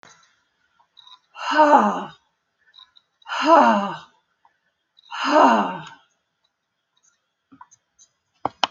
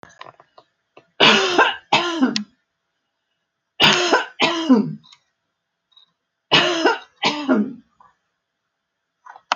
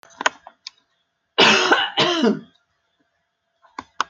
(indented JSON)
{
  "exhalation_length": "8.7 s",
  "exhalation_amplitude": 27154,
  "exhalation_signal_mean_std_ratio": 0.34,
  "three_cough_length": "9.6 s",
  "three_cough_amplitude": 30365,
  "three_cough_signal_mean_std_ratio": 0.43,
  "cough_length": "4.1 s",
  "cough_amplitude": 30837,
  "cough_signal_mean_std_ratio": 0.39,
  "survey_phase": "beta (2021-08-13 to 2022-03-07)",
  "age": "65+",
  "gender": "Female",
  "wearing_mask": "No",
  "symptom_none": true,
  "smoker_status": "Never smoked",
  "respiratory_condition_asthma": false,
  "respiratory_condition_other": false,
  "recruitment_source": "REACT",
  "submission_delay": "3 days",
  "covid_test_result": "Negative",
  "covid_test_method": "RT-qPCR"
}